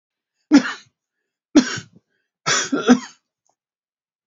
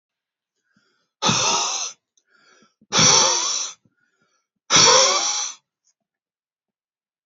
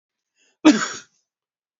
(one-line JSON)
{"three_cough_length": "4.3 s", "three_cough_amplitude": 29378, "three_cough_signal_mean_std_ratio": 0.3, "exhalation_length": "7.3 s", "exhalation_amplitude": 28844, "exhalation_signal_mean_std_ratio": 0.42, "cough_length": "1.8 s", "cough_amplitude": 28306, "cough_signal_mean_std_ratio": 0.25, "survey_phase": "beta (2021-08-13 to 2022-03-07)", "age": "65+", "gender": "Male", "wearing_mask": "No", "symptom_none": true, "smoker_status": "Ex-smoker", "respiratory_condition_asthma": false, "respiratory_condition_other": false, "recruitment_source": "REACT", "submission_delay": "2 days", "covid_test_result": "Negative", "covid_test_method": "RT-qPCR", "influenza_a_test_result": "Negative", "influenza_b_test_result": "Negative"}